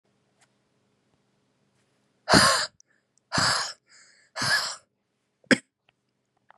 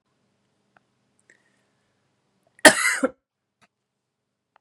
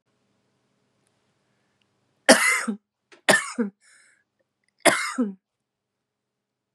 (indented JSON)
{
  "exhalation_length": "6.6 s",
  "exhalation_amplitude": 21841,
  "exhalation_signal_mean_std_ratio": 0.3,
  "cough_length": "4.6 s",
  "cough_amplitude": 32768,
  "cough_signal_mean_std_ratio": 0.17,
  "three_cough_length": "6.7 s",
  "three_cough_amplitude": 31202,
  "three_cough_signal_mean_std_ratio": 0.28,
  "survey_phase": "beta (2021-08-13 to 2022-03-07)",
  "age": "18-44",
  "gender": "Female",
  "wearing_mask": "No",
  "symptom_cough_any": true,
  "symptom_runny_or_blocked_nose": true,
  "symptom_shortness_of_breath": true,
  "symptom_sore_throat": true,
  "symptom_fatigue": true,
  "symptom_headache": true,
  "symptom_change_to_sense_of_smell_or_taste": true,
  "symptom_onset": "2 days",
  "smoker_status": "Prefer not to say",
  "respiratory_condition_asthma": false,
  "respiratory_condition_other": false,
  "recruitment_source": "Test and Trace",
  "submission_delay": "2 days",
  "covid_test_result": "Positive",
  "covid_test_method": "RT-qPCR"
}